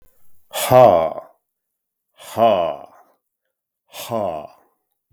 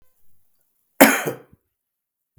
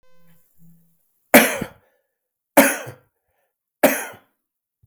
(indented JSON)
{
  "exhalation_length": "5.1 s",
  "exhalation_amplitude": 32768,
  "exhalation_signal_mean_std_ratio": 0.36,
  "cough_length": "2.4 s",
  "cough_amplitude": 32768,
  "cough_signal_mean_std_ratio": 0.23,
  "three_cough_length": "4.9 s",
  "three_cough_amplitude": 32768,
  "three_cough_signal_mean_std_ratio": 0.26,
  "survey_phase": "beta (2021-08-13 to 2022-03-07)",
  "age": "45-64",
  "gender": "Male",
  "wearing_mask": "No",
  "symptom_cough_any": true,
  "symptom_fatigue": true,
  "symptom_fever_high_temperature": true,
  "smoker_status": "Ex-smoker",
  "respiratory_condition_asthma": true,
  "respiratory_condition_other": false,
  "recruitment_source": "Test and Trace",
  "submission_delay": "0 days",
  "covid_test_result": "Positive",
  "covid_test_method": "LFT"
}